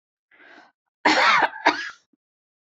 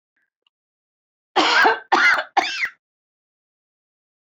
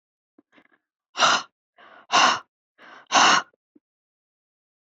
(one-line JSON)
{"cough_length": "2.6 s", "cough_amplitude": 26001, "cough_signal_mean_std_ratio": 0.4, "three_cough_length": "4.3 s", "three_cough_amplitude": 23886, "three_cough_signal_mean_std_ratio": 0.39, "exhalation_length": "4.9 s", "exhalation_amplitude": 23124, "exhalation_signal_mean_std_ratio": 0.32, "survey_phase": "beta (2021-08-13 to 2022-03-07)", "age": "65+", "gender": "Female", "wearing_mask": "No", "symptom_runny_or_blocked_nose": true, "symptom_abdominal_pain": true, "symptom_fatigue": true, "symptom_fever_high_temperature": true, "symptom_headache": true, "symptom_onset": "12 days", "smoker_status": "Never smoked", "respiratory_condition_asthma": true, "respiratory_condition_other": false, "recruitment_source": "REACT", "submission_delay": "2 days", "covid_test_result": "Negative", "covid_test_method": "RT-qPCR"}